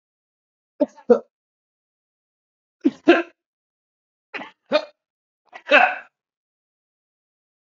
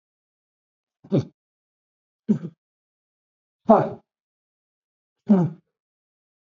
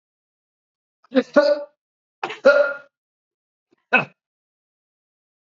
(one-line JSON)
{"cough_length": "7.7 s", "cough_amplitude": 28833, "cough_signal_mean_std_ratio": 0.23, "exhalation_length": "6.5 s", "exhalation_amplitude": 27443, "exhalation_signal_mean_std_ratio": 0.23, "three_cough_length": "5.5 s", "three_cough_amplitude": 27473, "three_cough_signal_mean_std_ratio": 0.28, "survey_phase": "beta (2021-08-13 to 2022-03-07)", "age": "65+", "gender": "Male", "wearing_mask": "No", "symptom_shortness_of_breath": true, "symptom_sore_throat": true, "symptom_onset": "12 days", "smoker_status": "Ex-smoker", "respiratory_condition_asthma": false, "respiratory_condition_other": false, "recruitment_source": "REACT", "submission_delay": "3 days", "covid_test_result": "Negative", "covid_test_method": "RT-qPCR", "influenza_a_test_result": "Unknown/Void", "influenza_b_test_result": "Unknown/Void"}